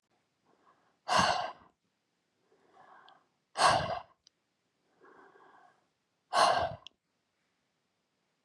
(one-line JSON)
{"exhalation_length": "8.4 s", "exhalation_amplitude": 8170, "exhalation_signal_mean_std_ratio": 0.3, "survey_phase": "beta (2021-08-13 to 2022-03-07)", "age": "45-64", "gender": "Female", "wearing_mask": "No", "symptom_none": true, "smoker_status": "Never smoked", "respiratory_condition_asthma": true, "respiratory_condition_other": false, "recruitment_source": "REACT", "submission_delay": "2 days", "covid_test_result": "Negative", "covid_test_method": "RT-qPCR"}